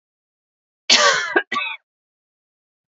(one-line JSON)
{"cough_length": "3.0 s", "cough_amplitude": 32767, "cough_signal_mean_std_ratio": 0.35, "survey_phase": "alpha (2021-03-01 to 2021-08-12)", "age": "18-44", "gender": "Female", "wearing_mask": "No", "symptom_fatigue": true, "symptom_loss_of_taste": true, "symptom_onset": "3 days", "smoker_status": "Ex-smoker", "respiratory_condition_asthma": false, "respiratory_condition_other": false, "recruitment_source": "Test and Trace", "submission_delay": "2 days", "covid_test_result": "Positive", "covid_test_method": "RT-qPCR", "covid_ct_value": 20.8, "covid_ct_gene": "ORF1ab gene", "covid_ct_mean": 20.8, "covid_viral_load": "150000 copies/ml", "covid_viral_load_category": "Low viral load (10K-1M copies/ml)"}